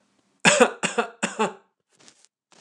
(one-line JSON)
{"three_cough_length": "2.6 s", "three_cough_amplitude": 29203, "three_cough_signal_mean_std_ratio": 0.34, "survey_phase": "beta (2021-08-13 to 2022-03-07)", "age": "45-64", "gender": "Male", "wearing_mask": "No", "symptom_none": true, "smoker_status": "Never smoked", "respiratory_condition_asthma": false, "respiratory_condition_other": false, "recruitment_source": "REACT", "submission_delay": "2 days", "covid_test_result": "Negative", "covid_test_method": "RT-qPCR", "influenza_a_test_result": "Negative", "influenza_b_test_result": "Negative"}